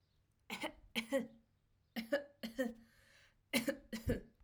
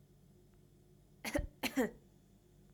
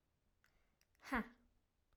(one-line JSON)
{"three_cough_length": "4.4 s", "three_cough_amplitude": 3185, "three_cough_signal_mean_std_ratio": 0.43, "cough_length": "2.7 s", "cough_amplitude": 2646, "cough_signal_mean_std_ratio": 0.35, "exhalation_length": "2.0 s", "exhalation_amplitude": 1310, "exhalation_signal_mean_std_ratio": 0.25, "survey_phase": "alpha (2021-03-01 to 2021-08-12)", "age": "18-44", "gender": "Female", "wearing_mask": "No", "symptom_none": true, "smoker_status": "Never smoked", "respiratory_condition_asthma": false, "respiratory_condition_other": false, "recruitment_source": "REACT", "submission_delay": "2 days", "covid_test_result": "Negative", "covid_test_method": "RT-qPCR"}